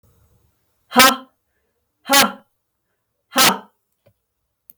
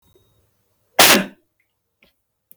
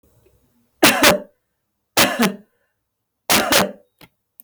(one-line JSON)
{"exhalation_length": "4.8 s", "exhalation_amplitude": 32768, "exhalation_signal_mean_std_ratio": 0.28, "cough_length": "2.6 s", "cough_amplitude": 32768, "cough_signal_mean_std_ratio": 0.24, "three_cough_length": "4.4 s", "three_cough_amplitude": 32768, "three_cough_signal_mean_std_ratio": 0.39, "survey_phase": "beta (2021-08-13 to 2022-03-07)", "age": "45-64", "gender": "Female", "wearing_mask": "No", "symptom_none": true, "smoker_status": "Ex-smoker", "respiratory_condition_asthma": false, "respiratory_condition_other": false, "recruitment_source": "REACT", "submission_delay": "2 days", "covid_test_result": "Negative", "covid_test_method": "RT-qPCR", "influenza_a_test_result": "Negative", "influenza_b_test_result": "Negative"}